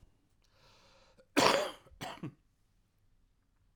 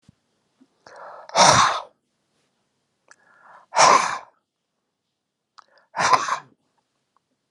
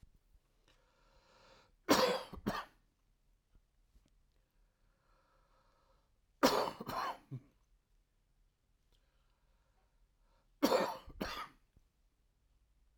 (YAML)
cough_length: 3.8 s
cough_amplitude: 10770
cough_signal_mean_std_ratio: 0.27
exhalation_length: 7.5 s
exhalation_amplitude: 32767
exhalation_signal_mean_std_ratio: 0.31
three_cough_length: 13.0 s
three_cough_amplitude: 7180
three_cough_signal_mean_std_ratio: 0.27
survey_phase: alpha (2021-03-01 to 2021-08-12)
age: 45-64
gender: Male
wearing_mask: 'No'
symptom_cough_any: true
smoker_status: Never smoked
respiratory_condition_asthma: false
respiratory_condition_other: true
recruitment_source: REACT
submission_delay: 3 days
covid_test_result: Negative
covid_test_method: RT-qPCR